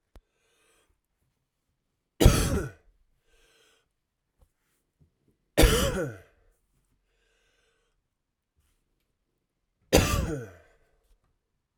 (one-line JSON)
{"three_cough_length": "11.8 s", "three_cough_amplitude": 21645, "three_cough_signal_mean_std_ratio": 0.24, "survey_phase": "alpha (2021-03-01 to 2021-08-12)", "age": "18-44", "gender": "Male", "wearing_mask": "No", "symptom_cough_any": true, "smoker_status": "Ex-smoker", "respiratory_condition_asthma": false, "respiratory_condition_other": false, "recruitment_source": "Test and Trace", "submission_delay": "1 day", "covid_test_result": "Positive", "covid_test_method": "RT-qPCR", "covid_ct_value": 19.0, "covid_ct_gene": "ORF1ab gene", "covid_ct_mean": 19.9, "covid_viral_load": "300000 copies/ml", "covid_viral_load_category": "Low viral load (10K-1M copies/ml)"}